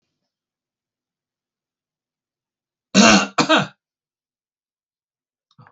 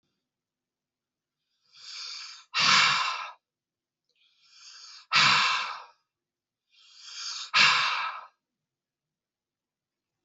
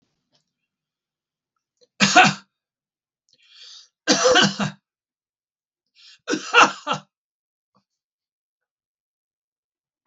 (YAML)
cough_length: 5.7 s
cough_amplitude: 32767
cough_signal_mean_std_ratio: 0.24
exhalation_length: 10.2 s
exhalation_amplitude: 15447
exhalation_signal_mean_std_ratio: 0.37
three_cough_length: 10.1 s
three_cough_amplitude: 32768
three_cough_signal_mean_std_ratio: 0.26
survey_phase: beta (2021-08-13 to 2022-03-07)
age: 65+
gender: Male
wearing_mask: 'No'
symptom_none: true
smoker_status: Never smoked
respiratory_condition_asthma: false
respiratory_condition_other: false
recruitment_source: REACT
submission_delay: 2 days
covid_test_result: Negative
covid_test_method: RT-qPCR